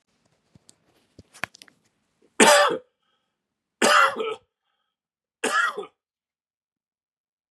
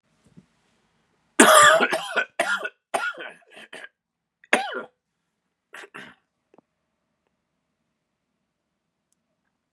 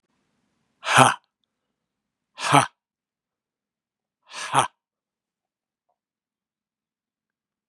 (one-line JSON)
{"three_cough_length": "7.5 s", "three_cough_amplitude": 27275, "three_cough_signal_mean_std_ratio": 0.3, "cough_length": "9.7 s", "cough_amplitude": 32768, "cough_signal_mean_std_ratio": 0.26, "exhalation_length": "7.7 s", "exhalation_amplitude": 32768, "exhalation_signal_mean_std_ratio": 0.2, "survey_phase": "beta (2021-08-13 to 2022-03-07)", "age": "45-64", "gender": "Male", "wearing_mask": "No", "symptom_cough_any": true, "symptom_runny_or_blocked_nose": true, "symptom_shortness_of_breath": true, "symptom_sore_throat": true, "symptom_fatigue": true, "smoker_status": "Never smoked", "respiratory_condition_asthma": false, "respiratory_condition_other": false, "recruitment_source": "Test and Trace", "submission_delay": "1 day", "covid_test_result": "Positive", "covid_test_method": "LFT"}